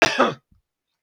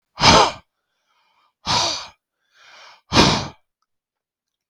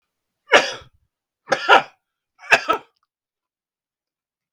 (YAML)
cough_length: 1.0 s
cough_amplitude: 32768
cough_signal_mean_std_ratio: 0.38
exhalation_length: 4.7 s
exhalation_amplitude: 32768
exhalation_signal_mean_std_ratio: 0.34
three_cough_length: 4.5 s
three_cough_amplitude: 32768
three_cough_signal_mean_std_ratio: 0.26
survey_phase: beta (2021-08-13 to 2022-03-07)
age: 65+
gender: Male
wearing_mask: 'No'
symptom_none: true
smoker_status: Ex-smoker
respiratory_condition_asthma: false
respiratory_condition_other: false
recruitment_source: REACT
submission_delay: 5 days
covid_test_result: Negative
covid_test_method: RT-qPCR
influenza_a_test_result: Negative
influenza_b_test_result: Negative